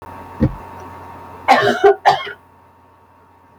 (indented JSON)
{
  "cough_length": "3.6 s",
  "cough_amplitude": 30597,
  "cough_signal_mean_std_ratio": 0.41,
  "survey_phase": "alpha (2021-03-01 to 2021-08-12)",
  "age": "45-64",
  "gender": "Female",
  "wearing_mask": "No",
  "symptom_none": true,
  "smoker_status": "Never smoked",
  "respiratory_condition_asthma": false,
  "respiratory_condition_other": false,
  "recruitment_source": "REACT",
  "submission_delay": "4 days",
  "covid_test_result": "Negative",
  "covid_test_method": "RT-qPCR"
}